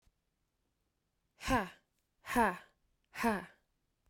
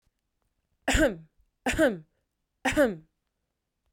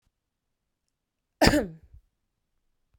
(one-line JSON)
{"exhalation_length": "4.1 s", "exhalation_amplitude": 4101, "exhalation_signal_mean_std_ratio": 0.32, "three_cough_length": "3.9 s", "three_cough_amplitude": 10249, "three_cough_signal_mean_std_ratio": 0.36, "cough_length": "3.0 s", "cough_amplitude": 27108, "cough_signal_mean_std_ratio": 0.22, "survey_phase": "beta (2021-08-13 to 2022-03-07)", "age": "18-44", "gender": "Female", "wearing_mask": "No", "symptom_abdominal_pain": true, "symptom_fatigue": true, "symptom_fever_high_temperature": true, "symptom_headache": true, "symptom_onset": "3 days", "smoker_status": "Never smoked", "respiratory_condition_asthma": false, "respiratory_condition_other": false, "recruitment_source": "Test and Trace", "submission_delay": "1 day", "covid_test_result": "Positive", "covid_test_method": "RT-qPCR"}